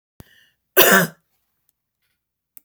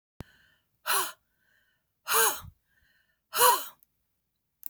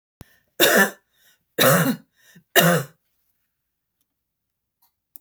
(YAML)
cough_length: 2.6 s
cough_amplitude: 32768
cough_signal_mean_std_ratio: 0.27
exhalation_length: 4.7 s
exhalation_amplitude: 12668
exhalation_signal_mean_std_ratio: 0.32
three_cough_length: 5.2 s
three_cough_amplitude: 32768
three_cough_signal_mean_std_ratio: 0.34
survey_phase: beta (2021-08-13 to 2022-03-07)
age: 65+
gender: Female
wearing_mask: 'No'
symptom_none: true
smoker_status: Never smoked
respiratory_condition_asthma: false
respiratory_condition_other: true
recruitment_source: REACT
submission_delay: 1 day
covid_test_result: Negative
covid_test_method: RT-qPCR